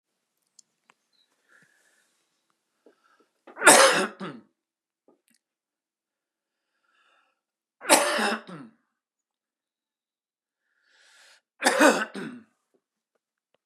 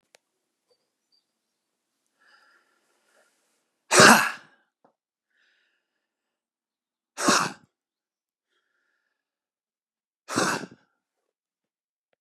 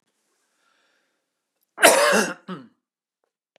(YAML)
three_cough_length: 13.7 s
three_cough_amplitude: 31891
three_cough_signal_mean_std_ratio: 0.23
exhalation_length: 12.2 s
exhalation_amplitude: 31430
exhalation_signal_mean_std_ratio: 0.19
cough_length: 3.6 s
cough_amplitude: 32128
cough_signal_mean_std_ratio: 0.29
survey_phase: beta (2021-08-13 to 2022-03-07)
age: 45-64
gender: Male
wearing_mask: 'No'
symptom_none: true
smoker_status: Never smoked
respiratory_condition_asthma: false
respiratory_condition_other: false
recruitment_source: REACT
submission_delay: 2 days
covid_test_result: Negative
covid_test_method: RT-qPCR
influenza_a_test_result: Negative
influenza_b_test_result: Negative